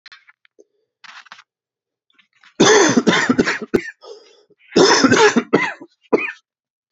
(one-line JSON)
{"cough_length": "6.9 s", "cough_amplitude": 31005, "cough_signal_mean_std_ratio": 0.43, "survey_phase": "beta (2021-08-13 to 2022-03-07)", "age": "18-44", "gender": "Male", "wearing_mask": "No", "symptom_cough_any": true, "symptom_runny_or_blocked_nose": true, "symptom_fatigue": true, "symptom_onset": "2 days", "smoker_status": "Never smoked", "respiratory_condition_asthma": false, "respiratory_condition_other": false, "recruitment_source": "Test and Trace", "submission_delay": "2 days", "covid_test_result": "Positive", "covid_test_method": "RT-qPCR", "covid_ct_value": 16.2, "covid_ct_gene": "S gene", "covid_ct_mean": 16.8, "covid_viral_load": "3100000 copies/ml", "covid_viral_load_category": "High viral load (>1M copies/ml)"}